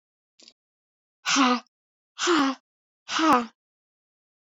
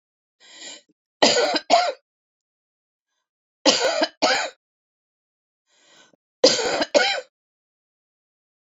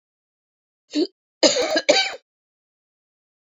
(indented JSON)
{
  "exhalation_length": "4.4 s",
  "exhalation_amplitude": 15918,
  "exhalation_signal_mean_std_ratio": 0.39,
  "three_cough_length": "8.6 s",
  "three_cough_amplitude": 29275,
  "three_cough_signal_mean_std_ratio": 0.36,
  "cough_length": "3.5 s",
  "cough_amplitude": 28736,
  "cough_signal_mean_std_ratio": 0.34,
  "survey_phase": "beta (2021-08-13 to 2022-03-07)",
  "age": "45-64",
  "gender": "Female",
  "wearing_mask": "No",
  "symptom_cough_any": true,
  "symptom_sore_throat": true,
  "symptom_fatigue": true,
  "symptom_fever_high_temperature": true,
  "symptom_headache": true,
  "symptom_onset": "7 days",
  "smoker_status": "Never smoked",
  "respiratory_condition_asthma": false,
  "respiratory_condition_other": false,
  "recruitment_source": "REACT",
  "submission_delay": "0 days",
  "covid_test_result": "Negative",
  "covid_test_method": "RT-qPCR"
}